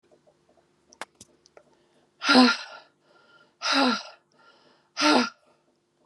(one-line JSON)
{"exhalation_length": "6.1 s", "exhalation_amplitude": 21853, "exhalation_signal_mean_std_ratio": 0.33, "survey_phase": "beta (2021-08-13 to 2022-03-07)", "age": "45-64", "gender": "Female", "wearing_mask": "No", "symptom_cough_any": true, "symptom_runny_or_blocked_nose": true, "symptom_sore_throat": true, "symptom_diarrhoea": true, "symptom_fatigue": true, "symptom_fever_high_temperature": true, "symptom_headache": true, "symptom_change_to_sense_of_smell_or_taste": true, "symptom_onset": "4 days", "smoker_status": "Never smoked", "respiratory_condition_asthma": false, "respiratory_condition_other": false, "recruitment_source": "Test and Trace", "submission_delay": "2 days", "covid_test_result": "Positive", "covid_test_method": "RT-qPCR"}